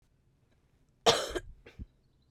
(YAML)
cough_length: 2.3 s
cough_amplitude: 13538
cough_signal_mean_std_ratio: 0.27
survey_phase: beta (2021-08-13 to 2022-03-07)
age: 18-44
gender: Female
wearing_mask: 'No'
symptom_cough_any: true
symptom_shortness_of_breath: true
symptom_fatigue: true
symptom_headache: true
smoker_status: Current smoker (1 to 10 cigarettes per day)
respiratory_condition_asthma: false
respiratory_condition_other: false
recruitment_source: Test and Trace
submission_delay: 1 day
covid_test_result: Positive
covid_test_method: LFT